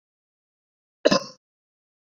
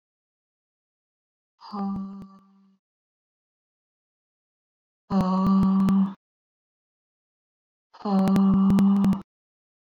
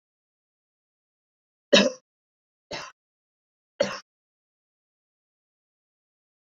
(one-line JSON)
{"cough_length": "2.0 s", "cough_amplitude": 25457, "cough_signal_mean_std_ratio": 0.19, "exhalation_length": "10.0 s", "exhalation_amplitude": 8140, "exhalation_signal_mean_std_ratio": 0.47, "three_cough_length": "6.6 s", "three_cough_amplitude": 22075, "three_cough_signal_mean_std_ratio": 0.16, "survey_phase": "beta (2021-08-13 to 2022-03-07)", "age": "18-44", "gender": "Female", "wearing_mask": "No", "symptom_cough_any": true, "symptom_new_continuous_cough": true, "symptom_shortness_of_breath": true, "symptom_sore_throat": true, "symptom_onset": "5 days", "smoker_status": "Never smoked", "respiratory_condition_asthma": true, "respiratory_condition_other": false, "recruitment_source": "Test and Trace", "submission_delay": "2 days", "covid_test_result": "Positive", "covid_test_method": "RT-qPCR", "covid_ct_value": 25.5, "covid_ct_gene": "N gene", "covid_ct_mean": 25.9, "covid_viral_load": "3100 copies/ml", "covid_viral_load_category": "Minimal viral load (< 10K copies/ml)"}